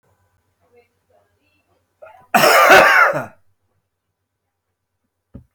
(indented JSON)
{
  "cough_length": "5.5 s",
  "cough_amplitude": 31968,
  "cough_signal_mean_std_ratio": 0.33,
  "survey_phase": "beta (2021-08-13 to 2022-03-07)",
  "age": "45-64",
  "gender": "Male",
  "wearing_mask": "No",
  "symptom_cough_any": true,
  "symptom_shortness_of_breath": true,
  "symptom_fatigue": true,
  "symptom_change_to_sense_of_smell_or_taste": true,
  "symptom_onset": "6 days",
  "smoker_status": "Never smoked",
  "respiratory_condition_asthma": false,
  "respiratory_condition_other": false,
  "recruitment_source": "Test and Trace",
  "submission_delay": "1 day",
  "covid_test_result": "Positive",
  "covid_test_method": "RT-qPCR",
  "covid_ct_value": 21.4,
  "covid_ct_gene": "ORF1ab gene",
  "covid_ct_mean": 22.1,
  "covid_viral_load": "56000 copies/ml",
  "covid_viral_load_category": "Low viral load (10K-1M copies/ml)"
}